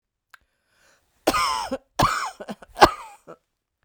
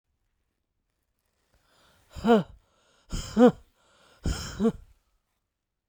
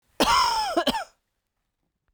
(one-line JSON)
{"three_cough_length": "3.8 s", "three_cough_amplitude": 32768, "three_cough_signal_mean_std_ratio": 0.32, "exhalation_length": "5.9 s", "exhalation_amplitude": 15638, "exhalation_signal_mean_std_ratio": 0.28, "cough_length": "2.1 s", "cough_amplitude": 15319, "cough_signal_mean_std_ratio": 0.51, "survey_phase": "beta (2021-08-13 to 2022-03-07)", "age": "65+", "gender": "Female", "wearing_mask": "No", "symptom_headache": true, "symptom_onset": "12 days", "smoker_status": "Never smoked", "respiratory_condition_asthma": false, "respiratory_condition_other": false, "recruitment_source": "REACT", "submission_delay": "1 day", "covid_test_result": "Negative", "covid_test_method": "RT-qPCR", "influenza_a_test_result": "Negative", "influenza_b_test_result": "Negative"}